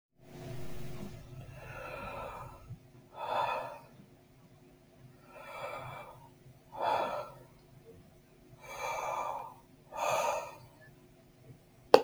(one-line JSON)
{"exhalation_length": "12.0 s", "exhalation_amplitude": 31764, "exhalation_signal_mean_std_ratio": 0.43, "survey_phase": "beta (2021-08-13 to 2022-03-07)", "age": "18-44", "gender": "Male", "wearing_mask": "No", "symptom_none": true, "smoker_status": "Current smoker (e-cigarettes or vapes only)", "respiratory_condition_asthma": false, "respiratory_condition_other": false, "recruitment_source": "REACT", "submission_delay": "1 day", "covid_test_result": "Negative", "covid_test_method": "RT-qPCR"}